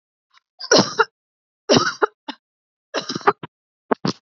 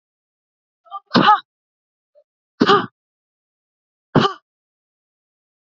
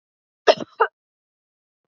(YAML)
three_cough_length: 4.4 s
three_cough_amplitude: 27998
three_cough_signal_mean_std_ratio: 0.32
exhalation_length: 5.6 s
exhalation_amplitude: 30292
exhalation_signal_mean_std_ratio: 0.25
cough_length: 1.9 s
cough_amplitude: 31318
cough_signal_mean_std_ratio: 0.2
survey_phase: beta (2021-08-13 to 2022-03-07)
age: 18-44
gender: Female
wearing_mask: 'No'
symptom_cough_any: true
symptom_sore_throat: true
symptom_onset: 4 days
smoker_status: Never smoked
respiratory_condition_asthma: true
respiratory_condition_other: false
recruitment_source: REACT
submission_delay: 1 day
covid_test_result: Positive
covid_test_method: RT-qPCR
covid_ct_value: 22.0
covid_ct_gene: E gene
influenza_a_test_result: Negative
influenza_b_test_result: Negative